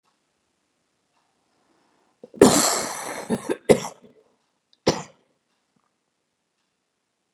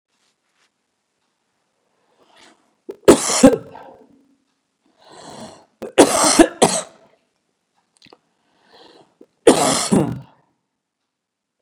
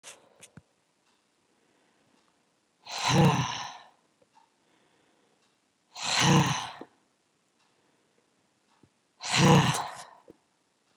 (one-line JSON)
{"cough_length": "7.3 s", "cough_amplitude": 32728, "cough_signal_mean_std_ratio": 0.24, "three_cough_length": "11.6 s", "three_cough_amplitude": 32768, "three_cough_signal_mean_std_ratio": 0.27, "exhalation_length": "11.0 s", "exhalation_amplitude": 13359, "exhalation_signal_mean_std_ratio": 0.32, "survey_phase": "beta (2021-08-13 to 2022-03-07)", "age": "45-64", "gender": "Female", "wearing_mask": "No", "symptom_cough_any": true, "symptom_runny_or_blocked_nose": true, "symptom_shortness_of_breath": true, "symptom_sore_throat": true, "symptom_abdominal_pain": true, "symptom_fatigue": true, "symptom_headache": true, "symptom_other": true, "smoker_status": "Current smoker (11 or more cigarettes per day)", "respiratory_condition_asthma": false, "respiratory_condition_other": false, "recruitment_source": "Test and Trace", "submission_delay": "1 day", "covid_test_result": "Positive", "covid_test_method": "RT-qPCR", "covid_ct_value": 19.1, "covid_ct_gene": "ORF1ab gene", "covid_ct_mean": 19.3, "covid_viral_load": "450000 copies/ml", "covid_viral_load_category": "Low viral load (10K-1M copies/ml)"}